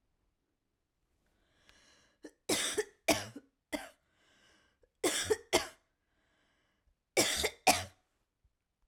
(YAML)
three_cough_length: 8.9 s
three_cough_amplitude: 9446
three_cough_signal_mean_std_ratio: 0.3
survey_phase: alpha (2021-03-01 to 2021-08-12)
age: 18-44
gender: Female
wearing_mask: 'No'
symptom_diarrhoea: true
symptom_fatigue: true
symptom_headache: true
symptom_onset: 3 days
smoker_status: Current smoker (e-cigarettes or vapes only)
respiratory_condition_asthma: true
respiratory_condition_other: false
recruitment_source: REACT
submission_delay: 1 day
covid_test_result: Negative
covid_test_method: RT-qPCR